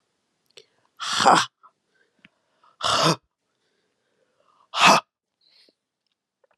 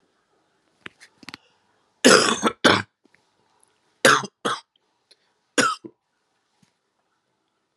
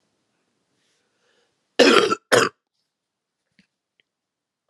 {"exhalation_length": "6.6 s", "exhalation_amplitude": 28664, "exhalation_signal_mean_std_ratio": 0.28, "three_cough_length": "7.8 s", "three_cough_amplitude": 32712, "three_cough_signal_mean_std_ratio": 0.27, "cough_length": "4.7 s", "cough_amplitude": 32767, "cough_signal_mean_std_ratio": 0.25, "survey_phase": "beta (2021-08-13 to 2022-03-07)", "age": "45-64", "gender": "Female", "wearing_mask": "No", "symptom_cough_any": true, "symptom_runny_or_blocked_nose": true, "symptom_sore_throat": true, "symptom_diarrhoea": true, "symptom_fatigue": true, "symptom_headache": true, "symptom_change_to_sense_of_smell_or_taste": true, "symptom_loss_of_taste": true, "symptom_other": true, "symptom_onset": "2 days", "smoker_status": "Never smoked", "respiratory_condition_asthma": false, "respiratory_condition_other": false, "recruitment_source": "Test and Trace", "submission_delay": "1 day", "covid_test_result": "Positive", "covid_test_method": "RT-qPCR", "covid_ct_value": 26.9, "covid_ct_gene": "ORF1ab gene"}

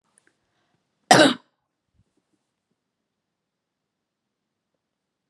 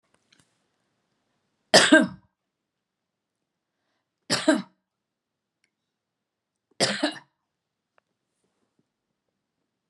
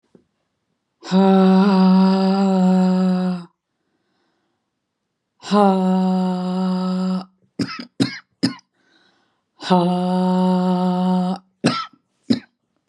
{"cough_length": "5.3 s", "cough_amplitude": 32628, "cough_signal_mean_std_ratio": 0.16, "three_cough_length": "9.9 s", "three_cough_amplitude": 26853, "three_cough_signal_mean_std_ratio": 0.2, "exhalation_length": "12.9 s", "exhalation_amplitude": 31094, "exhalation_signal_mean_std_ratio": 0.64, "survey_phase": "beta (2021-08-13 to 2022-03-07)", "age": "65+", "gender": "Female", "wearing_mask": "No", "symptom_runny_or_blocked_nose": true, "symptom_sore_throat": true, "symptom_abdominal_pain": true, "symptom_fatigue": true, "symptom_headache": true, "symptom_other": true, "symptom_onset": "4 days", "smoker_status": "Ex-smoker", "respiratory_condition_asthma": false, "respiratory_condition_other": false, "recruitment_source": "Test and Trace", "submission_delay": "2 days", "covid_test_result": "Negative", "covid_test_method": "ePCR"}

